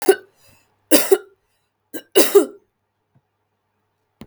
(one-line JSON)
{"three_cough_length": "4.3 s", "three_cough_amplitude": 32768, "three_cough_signal_mean_std_ratio": 0.28, "survey_phase": "beta (2021-08-13 to 2022-03-07)", "age": "18-44", "gender": "Female", "wearing_mask": "No", "symptom_none": true, "smoker_status": "Never smoked", "respiratory_condition_asthma": false, "respiratory_condition_other": false, "recruitment_source": "REACT", "submission_delay": "3 days", "covid_test_result": "Negative", "covid_test_method": "RT-qPCR", "influenza_a_test_result": "Negative", "influenza_b_test_result": "Negative"}